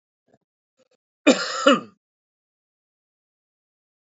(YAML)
cough_length: 4.2 s
cough_amplitude: 25816
cough_signal_mean_std_ratio: 0.22
survey_phase: beta (2021-08-13 to 2022-03-07)
age: 65+
gender: Male
wearing_mask: 'No'
symptom_cough_any: true
symptom_sore_throat: true
symptom_fatigue: true
symptom_headache: true
smoker_status: Current smoker (e-cigarettes or vapes only)
respiratory_condition_asthma: false
respiratory_condition_other: true
recruitment_source: Test and Trace
submission_delay: 2 days
covid_test_result: Negative
covid_test_method: LFT